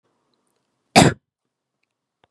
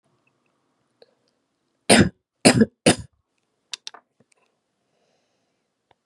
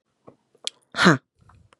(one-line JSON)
{"cough_length": "2.3 s", "cough_amplitude": 32768, "cough_signal_mean_std_ratio": 0.2, "three_cough_length": "6.1 s", "three_cough_amplitude": 32767, "three_cough_signal_mean_std_ratio": 0.21, "exhalation_length": "1.8 s", "exhalation_amplitude": 30721, "exhalation_signal_mean_std_ratio": 0.25, "survey_phase": "beta (2021-08-13 to 2022-03-07)", "age": "18-44", "gender": "Female", "wearing_mask": "No", "symptom_cough_any": true, "symptom_runny_or_blocked_nose": true, "symptom_headache": true, "symptom_onset": "4 days", "smoker_status": "Never smoked", "respiratory_condition_asthma": true, "respiratory_condition_other": false, "recruitment_source": "Test and Trace", "submission_delay": "2 days", "covid_test_result": "Positive", "covid_test_method": "ePCR"}